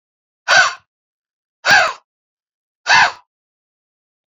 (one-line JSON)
{"exhalation_length": "4.3 s", "exhalation_amplitude": 28529, "exhalation_signal_mean_std_ratio": 0.33, "survey_phase": "beta (2021-08-13 to 2022-03-07)", "age": "45-64", "gender": "Male", "wearing_mask": "No", "symptom_none": true, "smoker_status": "Never smoked", "respiratory_condition_asthma": false, "respiratory_condition_other": false, "recruitment_source": "REACT", "submission_delay": "2 days", "covid_test_result": "Negative", "covid_test_method": "RT-qPCR", "influenza_a_test_result": "Negative", "influenza_b_test_result": "Negative"}